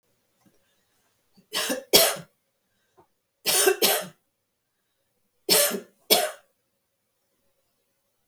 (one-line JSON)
{"three_cough_length": "8.3 s", "three_cough_amplitude": 32766, "three_cough_signal_mean_std_ratio": 0.32, "survey_phase": "beta (2021-08-13 to 2022-03-07)", "age": "65+", "gender": "Female", "wearing_mask": "No", "symptom_none": true, "smoker_status": "Never smoked", "respiratory_condition_asthma": false, "respiratory_condition_other": false, "recruitment_source": "REACT", "submission_delay": "1 day", "covid_test_result": "Negative", "covid_test_method": "RT-qPCR", "influenza_a_test_result": "Negative", "influenza_b_test_result": "Negative"}